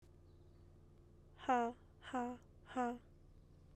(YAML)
exhalation_length: 3.8 s
exhalation_amplitude: 2011
exhalation_signal_mean_std_ratio: 0.42
survey_phase: beta (2021-08-13 to 2022-03-07)
age: 18-44
gender: Female
wearing_mask: 'No'
symptom_cough_any: true
symptom_shortness_of_breath: true
symptom_fatigue: true
symptom_headache: true
smoker_status: Current smoker (1 to 10 cigarettes per day)
respiratory_condition_asthma: false
respiratory_condition_other: false
recruitment_source: Test and Trace
submission_delay: 1 day
covid_test_result: Positive
covid_test_method: LFT